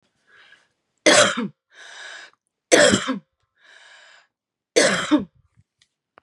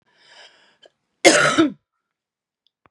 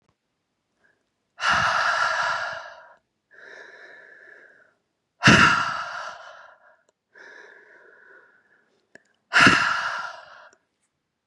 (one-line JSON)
{"three_cough_length": "6.2 s", "three_cough_amplitude": 32767, "three_cough_signal_mean_std_ratio": 0.34, "cough_length": "2.9 s", "cough_amplitude": 32768, "cough_signal_mean_std_ratio": 0.3, "exhalation_length": "11.3 s", "exhalation_amplitude": 28569, "exhalation_signal_mean_std_ratio": 0.37, "survey_phase": "beta (2021-08-13 to 2022-03-07)", "age": "18-44", "gender": "Female", "wearing_mask": "No", "symptom_sore_throat": true, "symptom_diarrhoea": true, "symptom_onset": "2 days", "smoker_status": "Ex-smoker", "respiratory_condition_asthma": true, "respiratory_condition_other": false, "recruitment_source": "Test and Trace", "submission_delay": "2 days", "covid_test_result": "Positive", "covid_test_method": "RT-qPCR", "covid_ct_value": 35.8, "covid_ct_gene": "ORF1ab gene"}